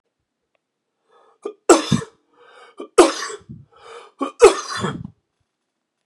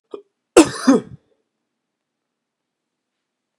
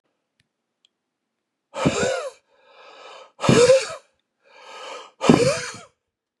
{"three_cough_length": "6.1 s", "three_cough_amplitude": 32768, "three_cough_signal_mean_std_ratio": 0.27, "cough_length": "3.6 s", "cough_amplitude": 32768, "cough_signal_mean_std_ratio": 0.21, "exhalation_length": "6.4 s", "exhalation_amplitude": 32768, "exhalation_signal_mean_std_ratio": 0.36, "survey_phase": "beta (2021-08-13 to 2022-03-07)", "age": "45-64", "gender": "Male", "wearing_mask": "No", "symptom_cough_any": true, "symptom_runny_or_blocked_nose": true, "symptom_fatigue": true, "symptom_headache": true, "smoker_status": "Never smoked", "respiratory_condition_asthma": true, "respiratory_condition_other": false, "recruitment_source": "Test and Trace", "submission_delay": "2 days", "covid_test_result": "Positive", "covid_test_method": "RT-qPCR", "covid_ct_value": 25.7, "covid_ct_gene": "ORF1ab gene", "covid_ct_mean": 25.8, "covid_viral_load": "3300 copies/ml", "covid_viral_load_category": "Minimal viral load (< 10K copies/ml)"}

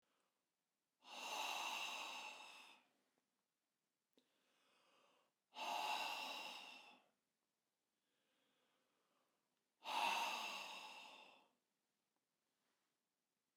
{"exhalation_length": "13.6 s", "exhalation_amplitude": 1117, "exhalation_signal_mean_std_ratio": 0.43, "survey_phase": "beta (2021-08-13 to 2022-03-07)", "age": "65+", "gender": "Male", "wearing_mask": "No", "symptom_runny_or_blocked_nose": true, "smoker_status": "Never smoked", "respiratory_condition_asthma": false, "respiratory_condition_other": false, "recruitment_source": "REACT", "submission_delay": "1 day", "covid_test_result": "Negative", "covid_test_method": "RT-qPCR"}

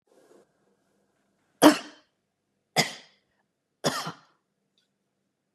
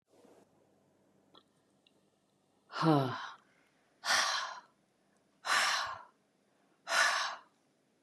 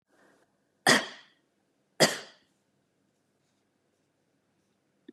{"three_cough_length": "5.5 s", "three_cough_amplitude": 32001, "three_cough_signal_mean_std_ratio": 0.19, "exhalation_length": "8.0 s", "exhalation_amplitude": 6399, "exhalation_signal_mean_std_ratio": 0.39, "cough_length": "5.1 s", "cough_amplitude": 15549, "cough_signal_mean_std_ratio": 0.19, "survey_phase": "beta (2021-08-13 to 2022-03-07)", "age": "45-64", "gender": "Female", "wearing_mask": "No", "symptom_sore_throat": true, "symptom_onset": "12 days", "smoker_status": "Never smoked", "respiratory_condition_asthma": false, "respiratory_condition_other": false, "recruitment_source": "REACT", "submission_delay": "1 day", "covid_test_result": "Negative", "covid_test_method": "RT-qPCR", "influenza_a_test_result": "Negative", "influenza_b_test_result": "Negative"}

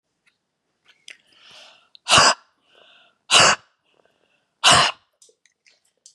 {"exhalation_length": "6.1 s", "exhalation_amplitude": 30126, "exhalation_signal_mean_std_ratio": 0.29, "survey_phase": "beta (2021-08-13 to 2022-03-07)", "age": "45-64", "gender": "Female", "wearing_mask": "No", "symptom_none": true, "smoker_status": "Never smoked", "respiratory_condition_asthma": false, "respiratory_condition_other": false, "recruitment_source": "REACT", "submission_delay": "3 days", "covid_test_result": "Negative", "covid_test_method": "RT-qPCR", "influenza_a_test_result": "Negative", "influenza_b_test_result": "Negative"}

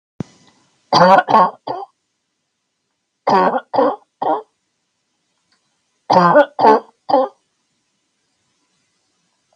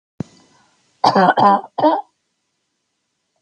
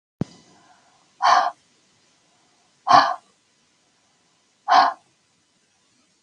{"three_cough_length": "9.6 s", "three_cough_amplitude": 32768, "three_cough_signal_mean_std_ratio": 0.37, "cough_length": "3.4 s", "cough_amplitude": 32768, "cough_signal_mean_std_ratio": 0.37, "exhalation_length": "6.2 s", "exhalation_amplitude": 31379, "exhalation_signal_mean_std_ratio": 0.28, "survey_phase": "beta (2021-08-13 to 2022-03-07)", "age": "65+", "gender": "Female", "wearing_mask": "No", "symptom_none": true, "smoker_status": "Never smoked", "respiratory_condition_asthma": false, "respiratory_condition_other": false, "recruitment_source": "REACT", "submission_delay": "1 day", "covid_test_result": "Negative", "covid_test_method": "RT-qPCR", "influenza_a_test_result": "Negative", "influenza_b_test_result": "Negative"}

